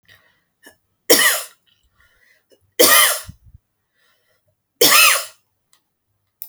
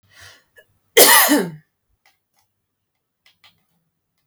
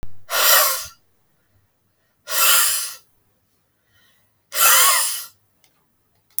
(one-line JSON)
{"three_cough_length": "6.5 s", "three_cough_amplitude": 32768, "three_cough_signal_mean_std_ratio": 0.33, "cough_length": "4.3 s", "cough_amplitude": 32768, "cough_signal_mean_std_ratio": 0.27, "exhalation_length": "6.4 s", "exhalation_amplitude": 32768, "exhalation_signal_mean_std_ratio": 0.45, "survey_phase": "beta (2021-08-13 to 2022-03-07)", "age": "45-64", "gender": "Female", "wearing_mask": "No", "symptom_cough_any": true, "smoker_status": "Never smoked", "respiratory_condition_asthma": false, "respiratory_condition_other": false, "recruitment_source": "REACT", "submission_delay": "1 day", "covid_test_result": "Negative", "covid_test_method": "RT-qPCR"}